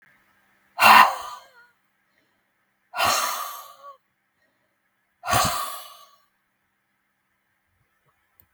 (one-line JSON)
{"exhalation_length": "8.5 s", "exhalation_amplitude": 32497, "exhalation_signal_mean_std_ratio": 0.27, "survey_phase": "beta (2021-08-13 to 2022-03-07)", "age": "45-64", "gender": "Female", "wearing_mask": "No", "symptom_cough_any": true, "symptom_runny_or_blocked_nose": true, "symptom_fatigue": true, "symptom_headache": true, "symptom_onset": "3 days", "smoker_status": "Never smoked", "respiratory_condition_asthma": false, "respiratory_condition_other": false, "recruitment_source": "Test and Trace", "submission_delay": "2 days", "covid_test_result": "Negative", "covid_test_method": "ePCR"}